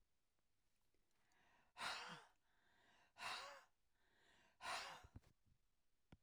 {"exhalation_length": "6.2 s", "exhalation_amplitude": 546, "exhalation_signal_mean_std_ratio": 0.42, "survey_phase": "alpha (2021-03-01 to 2021-08-12)", "age": "65+", "gender": "Female", "wearing_mask": "No", "symptom_none": true, "smoker_status": "Never smoked", "respiratory_condition_asthma": false, "respiratory_condition_other": false, "recruitment_source": "REACT", "submission_delay": "2 days", "covid_test_result": "Negative", "covid_test_method": "RT-qPCR"}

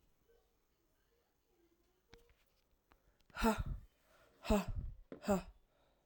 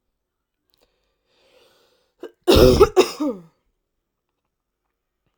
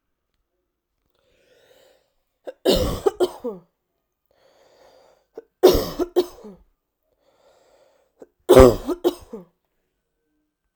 {"exhalation_length": "6.1 s", "exhalation_amplitude": 3101, "exhalation_signal_mean_std_ratio": 0.31, "cough_length": "5.4 s", "cough_amplitude": 32767, "cough_signal_mean_std_ratio": 0.27, "three_cough_length": "10.8 s", "three_cough_amplitude": 32768, "three_cough_signal_mean_std_ratio": 0.24, "survey_phase": "alpha (2021-03-01 to 2021-08-12)", "age": "18-44", "gender": "Female", "wearing_mask": "No", "symptom_abdominal_pain": true, "symptom_fatigue": true, "symptom_fever_high_temperature": true, "symptom_headache": true, "symptom_change_to_sense_of_smell_or_taste": true, "smoker_status": "Current smoker (1 to 10 cigarettes per day)", "respiratory_condition_asthma": false, "respiratory_condition_other": false, "recruitment_source": "Test and Trace", "submission_delay": "1 day", "covid_test_result": "Positive", "covid_test_method": "RT-qPCR"}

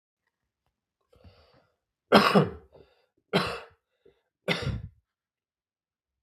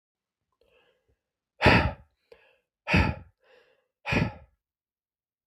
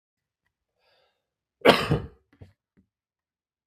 {"three_cough_length": "6.2 s", "three_cough_amplitude": 21042, "three_cough_signal_mean_std_ratio": 0.26, "exhalation_length": "5.5 s", "exhalation_amplitude": 15984, "exhalation_signal_mean_std_ratio": 0.29, "cough_length": "3.7 s", "cough_amplitude": 32766, "cough_signal_mean_std_ratio": 0.2, "survey_phase": "beta (2021-08-13 to 2022-03-07)", "age": "18-44", "gender": "Male", "wearing_mask": "No", "symptom_new_continuous_cough": true, "symptom_sore_throat": true, "symptom_abdominal_pain": true, "symptom_fatigue": true, "symptom_headache": true, "symptom_onset": "5 days", "smoker_status": "Never smoked", "respiratory_condition_asthma": false, "respiratory_condition_other": false, "recruitment_source": "Test and Trace", "submission_delay": "2 days", "covid_test_result": "Positive", "covid_test_method": "RT-qPCR", "covid_ct_value": 18.3, "covid_ct_gene": "ORF1ab gene"}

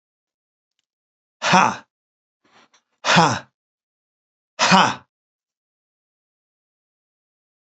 {"exhalation_length": "7.7 s", "exhalation_amplitude": 29191, "exhalation_signal_mean_std_ratio": 0.26, "survey_phase": "beta (2021-08-13 to 2022-03-07)", "age": "65+", "gender": "Male", "wearing_mask": "No", "symptom_none": true, "smoker_status": "Never smoked", "respiratory_condition_asthma": false, "respiratory_condition_other": false, "recruitment_source": "REACT", "submission_delay": "2 days", "covid_test_result": "Negative", "covid_test_method": "RT-qPCR", "influenza_a_test_result": "Negative", "influenza_b_test_result": "Negative"}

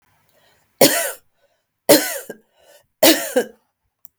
{"three_cough_length": "4.2 s", "three_cough_amplitude": 32768, "three_cough_signal_mean_std_ratio": 0.33, "survey_phase": "beta (2021-08-13 to 2022-03-07)", "age": "45-64", "gender": "Female", "wearing_mask": "No", "symptom_none": true, "smoker_status": "Never smoked", "respiratory_condition_asthma": false, "respiratory_condition_other": false, "recruitment_source": "REACT", "submission_delay": "2 days", "covid_test_result": "Negative", "covid_test_method": "RT-qPCR", "influenza_a_test_result": "Negative", "influenza_b_test_result": "Negative"}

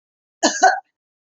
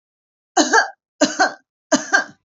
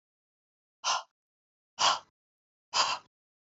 {"cough_length": "1.4 s", "cough_amplitude": 28889, "cough_signal_mean_std_ratio": 0.35, "three_cough_length": "2.5 s", "three_cough_amplitude": 32767, "three_cough_signal_mean_std_ratio": 0.43, "exhalation_length": "3.6 s", "exhalation_amplitude": 8846, "exhalation_signal_mean_std_ratio": 0.31, "survey_phase": "beta (2021-08-13 to 2022-03-07)", "age": "45-64", "gender": "Female", "wearing_mask": "No", "symptom_none": true, "smoker_status": "Never smoked", "respiratory_condition_asthma": false, "respiratory_condition_other": false, "recruitment_source": "REACT", "submission_delay": "2 days", "covid_test_result": "Negative", "covid_test_method": "RT-qPCR"}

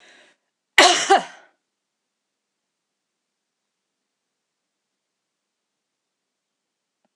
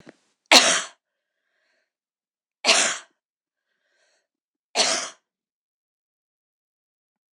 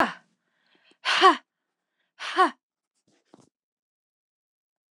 {"cough_length": "7.2 s", "cough_amplitude": 26028, "cough_signal_mean_std_ratio": 0.18, "three_cough_length": "7.3 s", "three_cough_amplitude": 26028, "three_cough_signal_mean_std_ratio": 0.25, "exhalation_length": "4.9 s", "exhalation_amplitude": 23888, "exhalation_signal_mean_std_ratio": 0.25, "survey_phase": "alpha (2021-03-01 to 2021-08-12)", "age": "65+", "gender": "Female", "wearing_mask": "No", "symptom_none": true, "smoker_status": "Never smoked", "respiratory_condition_asthma": false, "respiratory_condition_other": false, "recruitment_source": "REACT", "submission_delay": "1 day", "covid_test_result": "Negative", "covid_test_method": "RT-qPCR"}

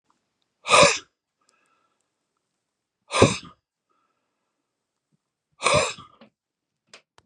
{"exhalation_length": "7.3 s", "exhalation_amplitude": 28668, "exhalation_signal_mean_std_ratio": 0.24, "survey_phase": "beta (2021-08-13 to 2022-03-07)", "age": "45-64", "gender": "Male", "wearing_mask": "No", "symptom_none": true, "smoker_status": "Ex-smoker", "respiratory_condition_asthma": false, "respiratory_condition_other": false, "recruitment_source": "REACT", "submission_delay": "32 days", "covid_test_result": "Negative", "covid_test_method": "RT-qPCR", "influenza_a_test_result": "Negative", "influenza_b_test_result": "Negative"}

